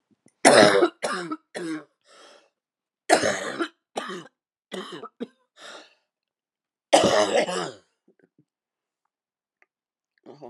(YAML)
three_cough_length: 10.5 s
three_cough_amplitude: 30989
three_cough_signal_mean_std_ratio: 0.33
survey_phase: beta (2021-08-13 to 2022-03-07)
age: 45-64
gender: Female
wearing_mask: 'No'
symptom_new_continuous_cough: true
symptom_runny_or_blocked_nose: true
symptom_shortness_of_breath: true
symptom_sore_throat: true
symptom_fatigue: true
symptom_change_to_sense_of_smell_or_taste: true
symptom_loss_of_taste: true
symptom_onset: 4 days
smoker_status: Ex-smoker
respiratory_condition_asthma: false
respiratory_condition_other: true
recruitment_source: Test and Trace
submission_delay: 2 days
covid_test_result: Positive
covid_test_method: RT-qPCR
covid_ct_value: 16.3
covid_ct_gene: ORF1ab gene
covid_ct_mean: 17.0
covid_viral_load: 2700000 copies/ml
covid_viral_load_category: High viral load (>1M copies/ml)